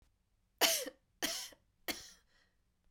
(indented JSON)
{
  "three_cough_length": "2.9 s",
  "three_cough_amplitude": 6513,
  "three_cough_signal_mean_std_ratio": 0.33,
  "survey_phase": "beta (2021-08-13 to 2022-03-07)",
  "age": "18-44",
  "gender": "Female",
  "wearing_mask": "No",
  "symptom_none": true,
  "smoker_status": "Never smoked",
  "respiratory_condition_asthma": true,
  "respiratory_condition_other": false,
  "recruitment_source": "Test and Trace",
  "submission_delay": "2 days",
  "covid_test_result": "Negative",
  "covid_test_method": "RT-qPCR"
}